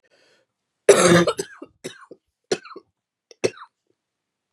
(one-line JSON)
{"cough_length": "4.5 s", "cough_amplitude": 32124, "cough_signal_mean_std_ratio": 0.28, "survey_phase": "beta (2021-08-13 to 2022-03-07)", "age": "45-64", "gender": "Female", "wearing_mask": "No", "symptom_cough_any": true, "symptom_new_continuous_cough": true, "symptom_runny_or_blocked_nose": true, "symptom_shortness_of_breath": true, "symptom_sore_throat": true, "symptom_fatigue": true, "symptom_headache": true, "symptom_onset": "4 days", "smoker_status": "Never smoked", "respiratory_condition_asthma": true, "respiratory_condition_other": false, "recruitment_source": "Test and Trace", "submission_delay": "2 days", "covid_test_result": "Positive", "covid_test_method": "ePCR"}